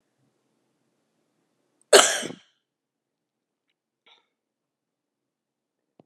{
  "cough_length": "6.1 s",
  "cough_amplitude": 32767,
  "cough_signal_mean_std_ratio": 0.15,
  "survey_phase": "alpha (2021-03-01 to 2021-08-12)",
  "age": "45-64",
  "gender": "Female",
  "wearing_mask": "No",
  "symptom_none": true,
  "smoker_status": "Never smoked",
  "respiratory_condition_asthma": true,
  "respiratory_condition_other": false,
  "recruitment_source": "REACT",
  "submission_delay": "1 day",
  "covid_test_result": "Negative",
  "covid_test_method": "RT-qPCR"
}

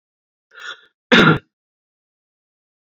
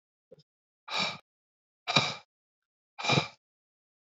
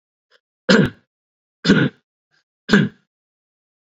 {
  "cough_length": "2.9 s",
  "cough_amplitude": 32005,
  "cough_signal_mean_std_ratio": 0.25,
  "exhalation_length": "4.0 s",
  "exhalation_amplitude": 14401,
  "exhalation_signal_mean_std_ratio": 0.31,
  "three_cough_length": "3.9 s",
  "three_cough_amplitude": 28497,
  "three_cough_signal_mean_std_ratio": 0.31,
  "survey_phase": "beta (2021-08-13 to 2022-03-07)",
  "age": "18-44",
  "gender": "Male",
  "wearing_mask": "No",
  "symptom_none": true,
  "smoker_status": "Ex-smoker",
  "respiratory_condition_asthma": false,
  "respiratory_condition_other": false,
  "recruitment_source": "REACT",
  "submission_delay": "1 day",
  "covid_test_result": "Negative",
  "covid_test_method": "RT-qPCR"
}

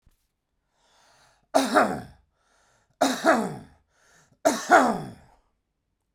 {
  "three_cough_length": "6.1 s",
  "three_cough_amplitude": 21592,
  "three_cough_signal_mean_std_ratio": 0.35,
  "survey_phase": "beta (2021-08-13 to 2022-03-07)",
  "age": "45-64",
  "gender": "Male",
  "wearing_mask": "No",
  "symptom_none": true,
  "smoker_status": "Ex-smoker",
  "respiratory_condition_asthma": false,
  "respiratory_condition_other": false,
  "recruitment_source": "REACT",
  "submission_delay": "1 day",
  "covid_test_result": "Negative",
  "covid_test_method": "RT-qPCR"
}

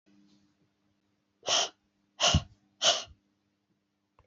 {
  "exhalation_length": "4.3 s",
  "exhalation_amplitude": 11376,
  "exhalation_signal_mean_std_ratio": 0.3,
  "survey_phase": "beta (2021-08-13 to 2022-03-07)",
  "age": "65+",
  "gender": "Female",
  "wearing_mask": "No",
  "symptom_none": true,
  "smoker_status": "Never smoked",
  "respiratory_condition_asthma": false,
  "respiratory_condition_other": false,
  "recruitment_source": "Test and Trace",
  "submission_delay": "1 day",
  "covid_test_result": "Negative",
  "covid_test_method": "LFT"
}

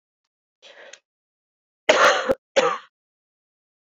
{
  "cough_length": "3.8 s",
  "cough_amplitude": 27624,
  "cough_signal_mean_std_ratio": 0.31,
  "survey_phase": "beta (2021-08-13 to 2022-03-07)",
  "age": "18-44",
  "gender": "Female",
  "wearing_mask": "No",
  "symptom_runny_or_blocked_nose": true,
  "symptom_sore_throat": true,
  "symptom_headache": true,
  "symptom_change_to_sense_of_smell_or_taste": true,
  "symptom_loss_of_taste": true,
  "smoker_status": "Never smoked",
  "respiratory_condition_asthma": false,
  "respiratory_condition_other": false,
  "recruitment_source": "Test and Trace",
  "submission_delay": "2 days",
  "covid_test_result": "Positive",
  "covid_test_method": "RT-qPCR",
  "covid_ct_value": 17.8,
  "covid_ct_gene": "N gene",
  "covid_ct_mean": 18.4,
  "covid_viral_load": "960000 copies/ml",
  "covid_viral_load_category": "Low viral load (10K-1M copies/ml)"
}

